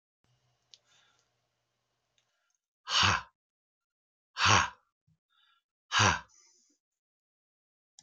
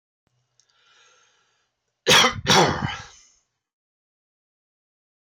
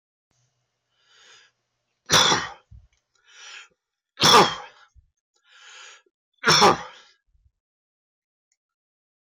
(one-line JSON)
{"exhalation_length": "8.0 s", "exhalation_amplitude": 11180, "exhalation_signal_mean_std_ratio": 0.26, "cough_length": "5.2 s", "cough_amplitude": 17284, "cough_signal_mean_std_ratio": 0.29, "three_cough_length": "9.3 s", "three_cough_amplitude": 17726, "three_cough_signal_mean_std_ratio": 0.27, "survey_phase": "alpha (2021-03-01 to 2021-08-12)", "age": "45-64", "gender": "Male", "wearing_mask": "No", "symptom_cough_any": true, "smoker_status": "Current smoker (11 or more cigarettes per day)", "respiratory_condition_asthma": false, "respiratory_condition_other": false, "recruitment_source": "REACT", "submission_delay": "2 days", "covid_test_result": "Negative", "covid_test_method": "RT-qPCR"}